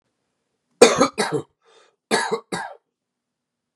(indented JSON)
{
  "cough_length": "3.8 s",
  "cough_amplitude": 32768,
  "cough_signal_mean_std_ratio": 0.31,
  "survey_phase": "beta (2021-08-13 to 2022-03-07)",
  "age": "18-44",
  "gender": "Male",
  "wearing_mask": "No",
  "symptom_cough_any": true,
  "symptom_runny_or_blocked_nose": true,
  "symptom_shortness_of_breath": true,
  "symptom_sore_throat": true,
  "symptom_abdominal_pain": true,
  "symptom_diarrhoea": true,
  "symptom_fatigue": true,
  "symptom_headache": true,
  "symptom_onset": "3 days",
  "smoker_status": "Ex-smoker",
  "respiratory_condition_asthma": false,
  "respiratory_condition_other": false,
  "recruitment_source": "Test and Trace",
  "submission_delay": "2 days",
  "covid_test_result": "Positive",
  "covid_test_method": "RT-qPCR",
  "covid_ct_value": 20.9,
  "covid_ct_gene": "ORF1ab gene",
  "covid_ct_mean": 21.9,
  "covid_viral_load": "67000 copies/ml",
  "covid_viral_load_category": "Low viral load (10K-1M copies/ml)"
}